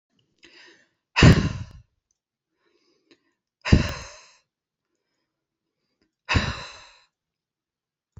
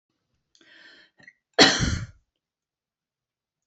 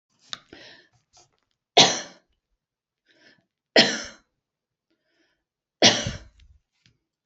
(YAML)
exhalation_length: 8.2 s
exhalation_amplitude: 26377
exhalation_signal_mean_std_ratio: 0.22
cough_length: 3.7 s
cough_amplitude: 28901
cough_signal_mean_std_ratio: 0.24
three_cough_length: 7.3 s
three_cough_amplitude: 30251
three_cough_signal_mean_std_ratio: 0.22
survey_phase: beta (2021-08-13 to 2022-03-07)
age: 45-64
gender: Female
wearing_mask: 'No'
symptom_none: true
smoker_status: Never smoked
respiratory_condition_asthma: false
respiratory_condition_other: false
recruitment_source: REACT
submission_delay: 3 days
covid_test_result: Negative
covid_test_method: RT-qPCR
influenza_a_test_result: Negative
influenza_b_test_result: Negative